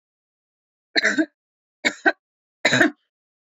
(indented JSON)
{
  "three_cough_length": "3.4 s",
  "three_cough_amplitude": 26069,
  "three_cough_signal_mean_std_ratio": 0.33,
  "survey_phase": "beta (2021-08-13 to 2022-03-07)",
  "age": "18-44",
  "gender": "Female",
  "wearing_mask": "No",
  "symptom_none": true,
  "smoker_status": "Ex-smoker",
  "respiratory_condition_asthma": false,
  "respiratory_condition_other": false,
  "recruitment_source": "REACT",
  "submission_delay": "2 days",
  "covid_test_result": "Negative",
  "covid_test_method": "RT-qPCR"
}